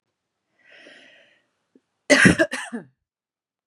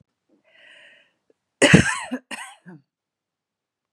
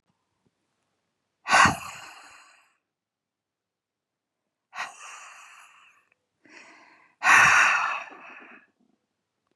{"three_cough_length": "3.7 s", "three_cough_amplitude": 30794, "three_cough_signal_mean_std_ratio": 0.26, "cough_length": "3.9 s", "cough_amplitude": 32767, "cough_signal_mean_std_ratio": 0.24, "exhalation_length": "9.6 s", "exhalation_amplitude": 21683, "exhalation_signal_mean_std_ratio": 0.28, "survey_phase": "beta (2021-08-13 to 2022-03-07)", "age": "45-64", "gender": "Female", "wearing_mask": "No", "symptom_cough_any": true, "symptom_runny_or_blocked_nose": true, "symptom_fatigue": true, "symptom_loss_of_taste": true, "smoker_status": "Never smoked", "respiratory_condition_asthma": false, "respiratory_condition_other": false, "recruitment_source": "REACT", "submission_delay": "4 days", "covid_test_result": "Negative", "covid_test_method": "RT-qPCR", "influenza_a_test_result": "Negative", "influenza_b_test_result": "Negative"}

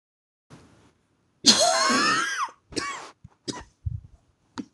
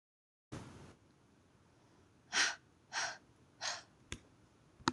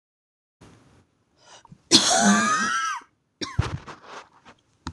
{"three_cough_length": "4.7 s", "three_cough_amplitude": 26027, "three_cough_signal_mean_std_ratio": 0.43, "exhalation_length": "4.9 s", "exhalation_amplitude": 6951, "exhalation_signal_mean_std_ratio": 0.32, "cough_length": "4.9 s", "cough_amplitude": 25735, "cough_signal_mean_std_ratio": 0.42, "survey_phase": "beta (2021-08-13 to 2022-03-07)", "age": "18-44", "gender": "Female", "wearing_mask": "No", "symptom_cough_any": true, "symptom_sore_throat": true, "symptom_headache": true, "symptom_onset": "2 days", "smoker_status": "Never smoked", "respiratory_condition_asthma": false, "respiratory_condition_other": false, "recruitment_source": "REACT", "submission_delay": "1 day", "covid_test_result": "Negative", "covid_test_method": "RT-qPCR"}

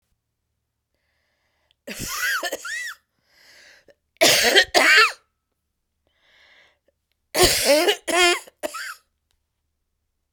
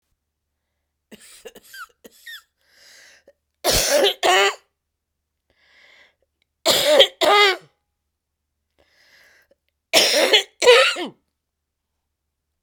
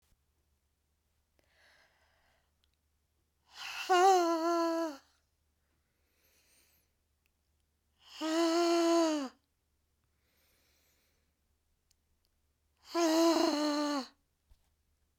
{"cough_length": "10.3 s", "cough_amplitude": 30602, "cough_signal_mean_std_ratio": 0.38, "three_cough_length": "12.6 s", "three_cough_amplitude": 32768, "three_cough_signal_mean_std_ratio": 0.35, "exhalation_length": "15.2 s", "exhalation_amplitude": 5932, "exhalation_signal_mean_std_ratio": 0.39, "survey_phase": "beta (2021-08-13 to 2022-03-07)", "age": "45-64", "gender": "Female", "wearing_mask": "No", "symptom_cough_any": true, "symptom_runny_or_blocked_nose": true, "symptom_shortness_of_breath": true, "symptom_sore_throat": true, "symptom_abdominal_pain": true, "symptom_fatigue": true, "symptom_headache": true, "symptom_onset": "13 days", "smoker_status": "Never smoked", "respiratory_condition_asthma": false, "respiratory_condition_other": true, "recruitment_source": "REACT", "submission_delay": "6 days", "covid_test_result": "Negative", "covid_test_method": "RT-qPCR", "influenza_a_test_result": "Negative", "influenza_b_test_result": "Negative"}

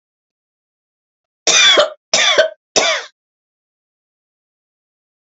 {"cough_length": "5.4 s", "cough_amplitude": 32768, "cough_signal_mean_std_ratio": 0.35, "survey_phase": "alpha (2021-03-01 to 2021-08-12)", "age": "65+", "gender": "Female", "wearing_mask": "No", "symptom_none": true, "smoker_status": "Never smoked", "respiratory_condition_asthma": true, "respiratory_condition_other": false, "recruitment_source": "REACT", "submission_delay": "3 days", "covid_test_result": "Negative", "covid_test_method": "RT-qPCR"}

